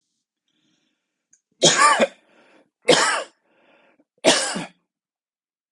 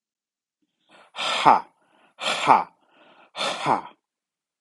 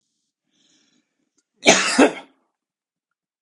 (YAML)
three_cough_length: 5.7 s
three_cough_amplitude: 30399
three_cough_signal_mean_std_ratio: 0.34
exhalation_length: 4.6 s
exhalation_amplitude: 32718
exhalation_signal_mean_std_ratio: 0.34
cough_length: 3.4 s
cough_amplitude: 32768
cough_signal_mean_std_ratio: 0.27
survey_phase: beta (2021-08-13 to 2022-03-07)
age: 45-64
gender: Male
wearing_mask: 'No'
symptom_none: true
smoker_status: Never smoked
respiratory_condition_asthma: false
respiratory_condition_other: false
recruitment_source: Test and Trace
submission_delay: 1 day
covid_test_result: Negative
covid_test_method: LFT